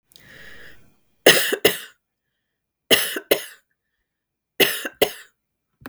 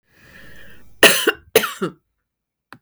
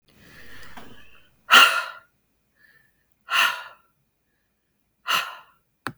{"three_cough_length": "5.9 s", "three_cough_amplitude": 32768, "three_cough_signal_mean_std_ratio": 0.3, "cough_length": "2.8 s", "cough_amplitude": 32768, "cough_signal_mean_std_ratio": 0.32, "exhalation_length": "6.0 s", "exhalation_amplitude": 32766, "exhalation_signal_mean_std_ratio": 0.29, "survey_phase": "beta (2021-08-13 to 2022-03-07)", "age": "45-64", "gender": "Female", "wearing_mask": "No", "symptom_none": true, "smoker_status": "Never smoked", "respiratory_condition_asthma": false, "respiratory_condition_other": false, "recruitment_source": "REACT", "submission_delay": "2 days", "covid_test_result": "Negative", "covid_test_method": "RT-qPCR", "influenza_a_test_result": "Negative", "influenza_b_test_result": "Negative"}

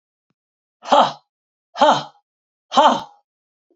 {"exhalation_length": "3.8 s", "exhalation_amplitude": 30908, "exhalation_signal_mean_std_ratio": 0.33, "survey_phase": "beta (2021-08-13 to 2022-03-07)", "age": "45-64", "gender": "Female", "wearing_mask": "No", "symptom_cough_any": true, "symptom_runny_or_blocked_nose": true, "symptom_shortness_of_breath": true, "symptom_sore_throat": true, "symptom_fatigue": true, "smoker_status": "Never smoked", "respiratory_condition_asthma": true, "respiratory_condition_other": false, "recruitment_source": "Test and Trace", "submission_delay": "1 day", "covid_test_result": "Positive", "covid_test_method": "LFT"}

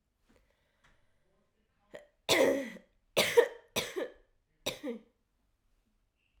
{"three_cough_length": "6.4 s", "three_cough_amplitude": 9541, "three_cough_signal_mean_std_ratio": 0.3, "survey_phase": "alpha (2021-03-01 to 2021-08-12)", "age": "18-44", "gender": "Female", "wearing_mask": "No", "symptom_cough_any": true, "symptom_onset": "4 days", "smoker_status": "Never smoked", "respiratory_condition_asthma": false, "respiratory_condition_other": false, "recruitment_source": "Test and Trace", "submission_delay": "2 days", "covid_test_result": "Positive", "covid_test_method": "ePCR"}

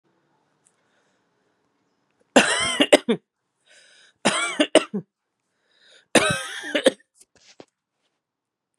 {"three_cough_length": "8.8 s", "three_cough_amplitude": 32767, "three_cough_signal_mean_std_ratio": 0.29, "survey_phase": "beta (2021-08-13 to 2022-03-07)", "age": "18-44", "gender": "Female", "wearing_mask": "No", "symptom_cough_any": true, "symptom_runny_or_blocked_nose": true, "symptom_fever_high_temperature": true, "symptom_headache": true, "symptom_onset": "4 days", "smoker_status": "Never smoked", "respiratory_condition_asthma": false, "respiratory_condition_other": false, "recruitment_source": "Test and Trace", "submission_delay": "2 days", "covid_test_result": "Positive", "covid_test_method": "RT-qPCR", "covid_ct_value": 26.8, "covid_ct_gene": "ORF1ab gene", "covid_ct_mean": 27.2, "covid_viral_load": "1200 copies/ml", "covid_viral_load_category": "Minimal viral load (< 10K copies/ml)"}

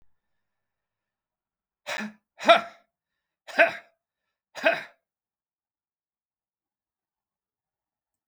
{"exhalation_length": "8.3 s", "exhalation_amplitude": 22694, "exhalation_signal_mean_std_ratio": 0.19, "survey_phase": "beta (2021-08-13 to 2022-03-07)", "age": "65+", "gender": "Male", "wearing_mask": "No", "symptom_none": true, "smoker_status": "Ex-smoker", "respiratory_condition_asthma": false, "respiratory_condition_other": false, "recruitment_source": "REACT", "submission_delay": "5 days", "covid_test_result": "Negative", "covid_test_method": "RT-qPCR"}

